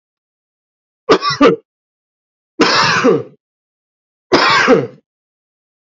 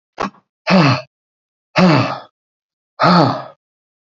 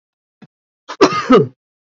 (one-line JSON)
{"three_cough_length": "5.9 s", "three_cough_amplitude": 30401, "three_cough_signal_mean_std_ratio": 0.43, "exhalation_length": "4.0 s", "exhalation_amplitude": 32768, "exhalation_signal_mean_std_ratio": 0.46, "cough_length": "1.9 s", "cough_amplitude": 28098, "cough_signal_mean_std_ratio": 0.36, "survey_phase": "alpha (2021-03-01 to 2021-08-12)", "age": "45-64", "gender": "Male", "wearing_mask": "No", "symptom_none": true, "smoker_status": "Never smoked", "respiratory_condition_asthma": false, "respiratory_condition_other": false, "recruitment_source": "REACT", "submission_delay": "1 day", "covid_test_result": "Negative", "covid_test_method": "RT-qPCR"}